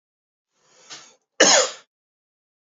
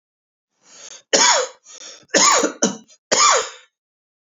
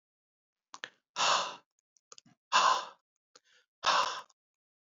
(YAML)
cough_length: 2.7 s
cough_amplitude: 28979
cough_signal_mean_std_ratio: 0.26
three_cough_length: 4.3 s
three_cough_amplitude: 30089
three_cough_signal_mean_std_ratio: 0.44
exhalation_length: 4.9 s
exhalation_amplitude: 8284
exhalation_signal_mean_std_ratio: 0.35
survey_phase: beta (2021-08-13 to 2022-03-07)
age: 18-44
gender: Male
wearing_mask: 'No'
symptom_cough_any: true
symptom_runny_or_blocked_nose: true
symptom_fatigue: true
symptom_loss_of_taste: true
symptom_onset: 5 days
smoker_status: Never smoked
respiratory_condition_asthma: false
respiratory_condition_other: false
recruitment_source: Test and Trace
submission_delay: 3 days
covid_test_result: Positive
covid_test_method: RT-qPCR